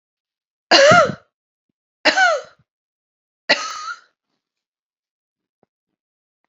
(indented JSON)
{
  "three_cough_length": "6.5 s",
  "three_cough_amplitude": 30316,
  "three_cough_signal_mean_std_ratio": 0.3,
  "survey_phase": "beta (2021-08-13 to 2022-03-07)",
  "age": "45-64",
  "gender": "Female",
  "wearing_mask": "No",
  "symptom_cough_any": true,
  "symptom_shortness_of_breath": true,
  "symptom_fatigue": true,
  "symptom_headache": true,
  "symptom_change_to_sense_of_smell_or_taste": true,
  "symptom_onset": "3 days",
  "smoker_status": "Ex-smoker",
  "respiratory_condition_asthma": false,
  "respiratory_condition_other": false,
  "recruitment_source": "Test and Trace",
  "submission_delay": "2 days",
  "covid_test_result": "Positive",
  "covid_test_method": "RT-qPCR",
  "covid_ct_value": 18.9,
  "covid_ct_gene": "ORF1ab gene",
  "covid_ct_mean": 19.4,
  "covid_viral_load": "440000 copies/ml",
  "covid_viral_load_category": "Low viral load (10K-1M copies/ml)"
}